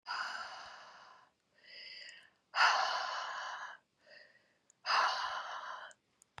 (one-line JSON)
{"exhalation_length": "6.4 s", "exhalation_amplitude": 5611, "exhalation_signal_mean_std_ratio": 0.49, "survey_phase": "beta (2021-08-13 to 2022-03-07)", "age": "45-64", "gender": "Female", "wearing_mask": "No", "symptom_cough_any": true, "symptom_runny_or_blocked_nose": true, "symptom_sore_throat": true, "symptom_other": true, "symptom_onset": "5 days", "smoker_status": "Never smoked", "respiratory_condition_asthma": false, "respiratory_condition_other": false, "recruitment_source": "Test and Trace", "submission_delay": "2 days", "covid_test_result": "Positive", "covid_test_method": "ePCR"}